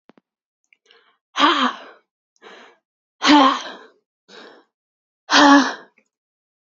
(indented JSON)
{
  "exhalation_length": "6.7 s",
  "exhalation_amplitude": 29300,
  "exhalation_signal_mean_std_ratio": 0.33,
  "survey_phase": "beta (2021-08-13 to 2022-03-07)",
  "age": "18-44",
  "gender": "Female",
  "wearing_mask": "No",
  "symptom_cough_any": true,
  "symptom_runny_or_blocked_nose": true,
  "symptom_shortness_of_breath": true,
  "symptom_sore_throat": true,
  "symptom_abdominal_pain": true,
  "symptom_diarrhoea": true,
  "symptom_fatigue": true,
  "symptom_fever_high_temperature": true,
  "symptom_headache": true,
  "symptom_change_to_sense_of_smell_or_taste": true,
  "symptom_onset": "13 days",
  "smoker_status": "Never smoked",
  "respiratory_condition_asthma": true,
  "respiratory_condition_other": false,
  "recruitment_source": "Test and Trace",
  "submission_delay": "1 day",
  "covid_test_result": "Positive",
  "covid_test_method": "RT-qPCR",
  "covid_ct_value": 28.4,
  "covid_ct_gene": "ORF1ab gene"
}